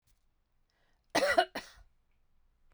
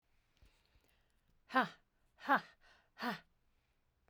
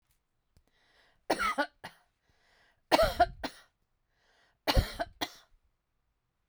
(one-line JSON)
{"cough_length": "2.7 s", "cough_amplitude": 7472, "cough_signal_mean_std_ratio": 0.28, "exhalation_length": "4.1 s", "exhalation_amplitude": 4195, "exhalation_signal_mean_std_ratio": 0.24, "three_cough_length": "6.5 s", "three_cough_amplitude": 12036, "three_cough_signal_mean_std_ratio": 0.29, "survey_phase": "beta (2021-08-13 to 2022-03-07)", "age": "45-64", "gender": "Female", "wearing_mask": "No", "symptom_none": true, "smoker_status": "Never smoked", "respiratory_condition_asthma": false, "respiratory_condition_other": false, "recruitment_source": "REACT", "submission_delay": "1 day", "covid_test_result": "Negative", "covid_test_method": "RT-qPCR", "influenza_a_test_result": "Negative", "influenza_b_test_result": "Negative"}